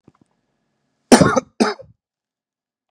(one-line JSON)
{"cough_length": "2.9 s", "cough_amplitude": 32768, "cough_signal_mean_std_ratio": 0.26, "survey_phase": "beta (2021-08-13 to 2022-03-07)", "age": "45-64", "gender": "Male", "wearing_mask": "No", "symptom_cough_any": true, "symptom_runny_or_blocked_nose": true, "symptom_headache": true, "symptom_onset": "3 days", "smoker_status": "Ex-smoker", "respiratory_condition_asthma": false, "respiratory_condition_other": false, "recruitment_source": "Test and Trace", "submission_delay": "2 days", "covid_test_result": "Positive", "covid_test_method": "RT-qPCR", "covid_ct_value": 18.7, "covid_ct_gene": "ORF1ab gene", "covid_ct_mean": 19.3, "covid_viral_load": "480000 copies/ml", "covid_viral_load_category": "Low viral load (10K-1M copies/ml)"}